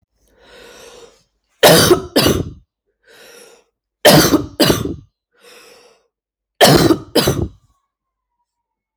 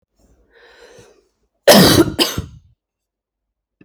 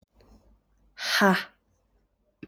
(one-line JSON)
{"three_cough_length": "9.0 s", "three_cough_amplitude": 32768, "three_cough_signal_mean_std_ratio": 0.38, "cough_length": "3.8 s", "cough_amplitude": 32768, "cough_signal_mean_std_ratio": 0.32, "exhalation_length": "2.5 s", "exhalation_amplitude": 14255, "exhalation_signal_mean_std_ratio": 0.32, "survey_phase": "alpha (2021-03-01 to 2021-08-12)", "age": "18-44", "gender": "Male", "wearing_mask": "No", "symptom_cough_any": true, "symptom_fatigue": true, "symptom_headache": true, "smoker_status": "Never smoked", "respiratory_condition_asthma": false, "respiratory_condition_other": false, "recruitment_source": "Test and Trace", "submission_delay": "5 days", "covid_test_result": "Positive", "covid_test_method": "RT-qPCR", "covid_ct_value": 13.2, "covid_ct_gene": "ORF1ab gene", "covid_ct_mean": 13.5, "covid_viral_load": "37000000 copies/ml", "covid_viral_load_category": "High viral load (>1M copies/ml)"}